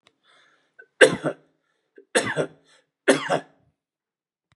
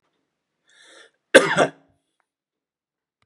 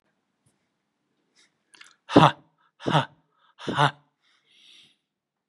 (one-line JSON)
{"three_cough_length": "4.6 s", "three_cough_amplitude": 32194, "three_cough_signal_mean_std_ratio": 0.27, "cough_length": "3.3 s", "cough_amplitude": 32768, "cough_signal_mean_std_ratio": 0.2, "exhalation_length": "5.5 s", "exhalation_amplitude": 29649, "exhalation_signal_mean_std_ratio": 0.22, "survey_phase": "beta (2021-08-13 to 2022-03-07)", "age": "65+", "gender": "Male", "wearing_mask": "No", "symptom_none": true, "smoker_status": "Prefer not to say", "respiratory_condition_asthma": false, "respiratory_condition_other": false, "recruitment_source": "REACT", "submission_delay": "1 day", "covid_test_result": "Negative", "covid_test_method": "RT-qPCR", "influenza_a_test_result": "Negative", "influenza_b_test_result": "Negative"}